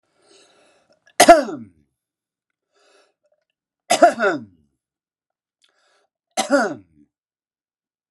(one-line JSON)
{"three_cough_length": "8.1 s", "three_cough_amplitude": 32768, "three_cough_signal_mean_std_ratio": 0.24, "survey_phase": "alpha (2021-03-01 to 2021-08-12)", "age": "45-64", "gender": "Male", "wearing_mask": "No", "symptom_none": true, "smoker_status": "Never smoked", "respiratory_condition_asthma": false, "respiratory_condition_other": false, "recruitment_source": "REACT", "submission_delay": "3 days", "covid_test_result": "Negative", "covid_test_method": "RT-qPCR"}